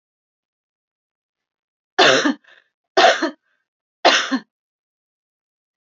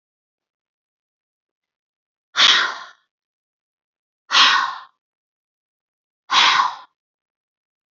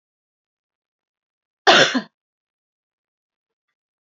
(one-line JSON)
{"three_cough_length": "5.8 s", "three_cough_amplitude": 30201, "three_cough_signal_mean_std_ratio": 0.31, "exhalation_length": "7.9 s", "exhalation_amplitude": 30039, "exhalation_signal_mean_std_ratio": 0.3, "cough_length": "4.0 s", "cough_amplitude": 29522, "cough_signal_mean_std_ratio": 0.21, "survey_phase": "beta (2021-08-13 to 2022-03-07)", "age": "45-64", "gender": "Female", "wearing_mask": "No", "symptom_none": true, "smoker_status": "Never smoked", "respiratory_condition_asthma": false, "respiratory_condition_other": false, "recruitment_source": "REACT", "submission_delay": "2 days", "covid_test_result": "Negative", "covid_test_method": "RT-qPCR", "influenza_a_test_result": "Negative", "influenza_b_test_result": "Negative"}